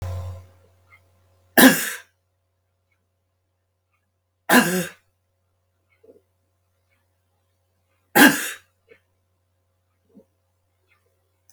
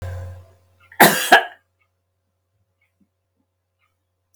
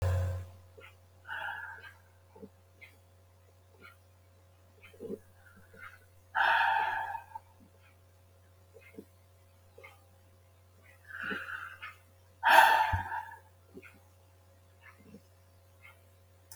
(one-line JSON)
{"three_cough_length": "11.5 s", "three_cough_amplitude": 32768, "three_cough_signal_mean_std_ratio": 0.22, "cough_length": "4.4 s", "cough_amplitude": 32768, "cough_signal_mean_std_ratio": 0.24, "exhalation_length": "16.6 s", "exhalation_amplitude": 16973, "exhalation_signal_mean_std_ratio": 0.33, "survey_phase": "beta (2021-08-13 to 2022-03-07)", "age": "65+", "gender": "Female", "wearing_mask": "No", "symptom_none": true, "smoker_status": "Never smoked", "respiratory_condition_asthma": false, "respiratory_condition_other": false, "recruitment_source": "REACT", "submission_delay": "1 day", "covid_test_result": "Negative", "covid_test_method": "RT-qPCR", "influenza_a_test_result": "Negative", "influenza_b_test_result": "Negative"}